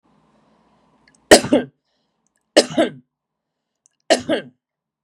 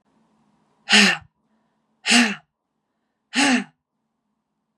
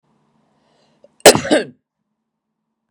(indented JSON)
{
  "three_cough_length": "5.0 s",
  "three_cough_amplitude": 32768,
  "three_cough_signal_mean_std_ratio": 0.25,
  "exhalation_length": "4.8 s",
  "exhalation_amplitude": 28228,
  "exhalation_signal_mean_std_ratio": 0.33,
  "cough_length": "2.9 s",
  "cough_amplitude": 32768,
  "cough_signal_mean_std_ratio": 0.22,
  "survey_phase": "beta (2021-08-13 to 2022-03-07)",
  "age": "45-64",
  "gender": "Female",
  "wearing_mask": "No",
  "symptom_runny_or_blocked_nose": true,
  "symptom_fatigue": true,
  "symptom_headache": true,
  "symptom_loss_of_taste": true,
  "symptom_onset": "6 days",
  "smoker_status": "Ex-smoker",
  "respiratory_condition_asthma": false,
  "respiratory_condition_other": false,
  "recruitment_source": "Test and Trace",
  "submission_delay": "1 day",
  "covid_test_result": "Positive",
  "covid_test_method": "RT-qPCR"
}